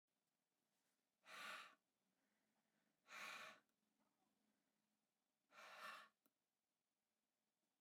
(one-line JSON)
{"exhalation_length": "7.8 s", "exhalation_amplitude": 223, "exhalation_signal_mean_std_ratio": 0.37, "survey_phase": "beta (2021-08-13 to 2022-03-07)", "age": "18-44", "gender": "Male", "wearing_mask": "No", "symptom_none": true, "smoker_status": "Never smoked", "respiratory_condition_asthma": false, "respiratory_condition_other": false, "recruitment_source": "REACT", "submission_delay": "3 days", "covid_test_result": "Negative", "covid_test_method": "RT-qPCR"}